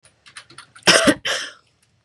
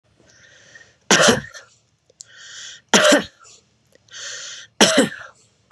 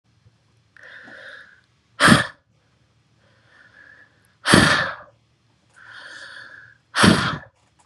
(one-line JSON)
{"cough_length": "2.0 s", "cough_amplitude": 32747, "cough_signal_mean_std_ratio": 0.36, "three_cough_length": "5.7 s", "three_cough_amplitude": 32767, "three_cough_signal_mean_std_ratio": 0.35, "exhalation_length": "7.9 s", "exhalation_amplitude": 32768, "exhalation_signal_mean_std_ratio": 0.31, "survey_phase": "beta (2021-08-13 to 2022-03-07)", "age": "18-44", "gender": "Female", "wearing_mask": "No", "symptom_none": true, "smoker_status": "Ex-smoker", "respiratory_condition_asthma": false, "respiratory_condition_other": false, "recruitment_source": "REACT", "submission_delay": "3 days", "covid_test_result": "Negative", "covid_test_method": "RT-qPCR", "influenza_a_test_result": "Negative", "influenza_b_test_result": "Negative"}